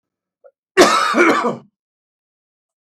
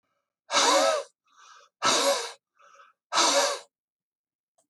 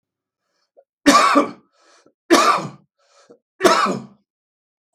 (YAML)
cough_length: 2.8 s
cough_amplitude: 32768
cough_signal_mean_std_ratio: 0.41
exhalation_length: 4.7 s
exhalation_amplitude: 12251
exhalation_signal_mean_std_ratio: 0.47
three_cough_length: 4.9 s
three_cough_amplitude: 32768
three_cough_signal_mean_std_ratio: 0.38
survey_phase: beta (2021-08-13 to 2022-03-07)
age: 65+
gender: Male
wearing_mask: 'No'
symptom_none: true
smoker_status: Ex-smoker
respiratory_condition_asthma: false
respiratory_condition_other: false
recruitment_source: REACT
submission_delay: 2 days
covid_test_result: Negative
covid_test_method: RT-qPCR
influenza_a_test_result: Negative
influenza_b_test_result: Negative